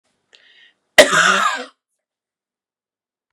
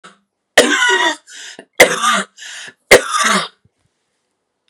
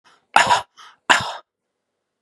{"cough_length": "3.3 s", "cough_amplitude": 32768, "cough_signal_mean_std_ratio": 0.3, "three_cough_length": "4.7 s", "three_cough_amplitude": 32768, "three_cough_signal_mean_std_ratio": 0.44, "exhalation_length": "2.2 s", "exhalation_amplitude": 32768, "exhalation_signal_mean_std_ratio": 0.32, "survey_phase": "beta (2021-08-13 to 2022-03-07)", "age": "45-64", "gender": "Female", "wearing_mask": "No", "symptom_none": true, "symptom_onset": "3 days", "smoker_status": "Ex-smoker", "respiratory_condition_asthma": false, "respiratory_condition_other": false, "recruitment_source": "REACT", "submission_delay": "2 days", "covid_test_result": "Negative", "covid_test_method": "RT-qPCR", "influenza_a_test_result": "Negative", "influenza_b_test_result": "Negative"}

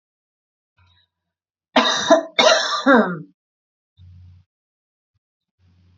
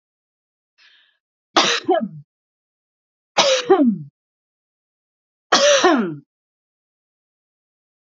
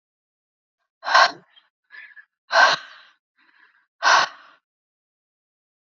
{"cough_length": "6.0 s", "cough_amplitude": 32150, "cough_signal_mean_std_ratio": 0.34, "three_cough_length": "8.0 s", "three_cough_amplitude": 29964, "three_cough_signal_mean_std_ratio": 0.36, "exhalation_length": "5.8 s", "exhalation_amplitude": 28434, "exhalation_signal_mean_std_ratio": 0.28, "survey_phase": "alpha (2021-03-01 to 2021-08-12)", "age": "45-64", "gender": "Female", "wearing_mask": "No", "symptom_change_to_sense_of_smell_or_taste": true, "smoker_status": "Never smoked", "respiratory_condition_asthma": false, "respiratory_condition_other": false, "recruitment_source": "REACT", "submission_delay": "1 day", "covid_test_result": "Negative", "covid_test_method": "RT-qPCR"}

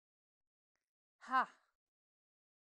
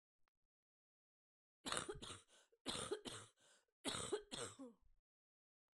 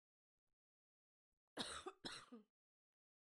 {"exhalation_length": "2.6 s", "exhalation_amplitude": 2742, "exhalation_signal_mean_std_ratio": 0.19, "three_cough_length": "5.8 s", "three_cough_amplitude": 2125, "three_cough_signal_mean_std_ratio": 0.41, "cough_length": "3.3 s", "cough_amplitude": 1000, "cough_signal_mean_std_ratio": 0.32, "survey_phase": "beta (2021-08-13 to 2022-03-07)", "age": "45-64", "gender": "Female", "wearing_mask": "No", "symptom_cough_any": true, "symptom_new_continuous_cough": true, "symptom_sore_throat": true, "symptom_fatigue": true, "symptom_headache": true, "symptom_other": true, "symptom_onset": "6 days", "smoker_status": "Never smoked", "respiratory_condition_asthma": false, "respiratory_condition_other": false, "recruitment_source": "Test and Trace", "submission_delay": "2 days", "covid_test_result": "Positive", "covid_test_method": "RT-qPCR", "covid_ct_value": 29.6, "covid_ct_gene": "ORF1ab gene"}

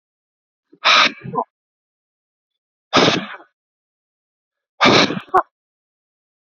{"exhalation_length": "6.5 s", "exhalation_amplitude": 32767, "exhalation_signal_mean_std_ratio": 0.32, "survey_phase": "beta (2021-08-13 to 2022-03-07)", "age": "45-64", "gender": "Male", "wearing_mask": "No", "symptom_cough_any": true, "symptom_new_continuous_cough": true, "symptom_runny_or_blocked_nose": true, "symptom_sore_throat": true, "symptom_abdominal_pain": true, "symptom_fever_high_temperature": true, "symptom_headache": true, "smoker_status": "Ex-smoker", "respiratory_condition_asthma": false, "respiratory_condition_other": false, "recruitment_source": "Test and Trace", "submission_delay": "0 days", "covid_test_result": "Positive", "covid_test_method": "LFT"}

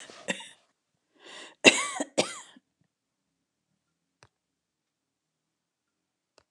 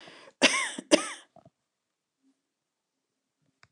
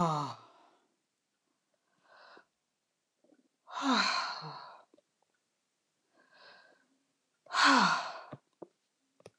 {"three_cough_length": "6.5 s", "three_cough_amplitude": 29192, "three_cough_signal_mean_std_ratio": 0.18, "cough_length": "3.7 s", "cough_amplitude": 18929, "cough_signal_mean_std_ratio": 0.24, "exhalation_length": "9.4 s", "exhalation_amplitude": 7440, "exhalation_signal_mean_std_ratio": 0.32, "survey_phase": "alpha (2021-03-01 to 2021-08-12)", "age": "45-64", "gender": "Female", "wearing_mask": "No", "symptom_none": true, "symptom_onset": "11 days", "smoker_status": "Never smoked", "respiratory_condition_asthma": false, "respiratory_condition_other": false, "recruitment_source": "REACT", "submission_delay": "1 day", "covid_test_result": "Negative", "covid_test_method": "RT-qPCR"}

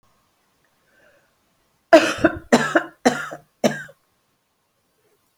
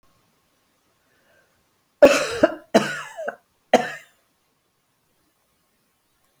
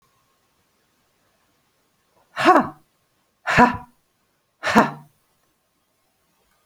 {"cough_length": "5.4 s", "cough_amplitude": 30881, "cough_signal_mean_std_ratio": 0.28, "three_cough_length": "6.4 s", "three_cough_amplitude": 31441, "three_cough_signal_mean_std_ratio": 0.24, "exhalation_length": "6.7 s", "exhalation_amplitude": 28950, "exhalation_signal_mean_std_ratio": 0.25, "survey_phase": "beta (2021-08-13 to 2022-03-07)", "age": "65+", "gender": "Female", "wearing_mask": "No", "symptom_none": true, "symptom_onset": "6 days", "smoker_status": "Ex-smoker", "respiratory_condition_asthma": false, "respiratory_condition_other": false, "recruitment_source": "REACT", "submission_delay": "1 day", "covid_test_result": "Negative", "covid_test_method": "RT-qPCR"}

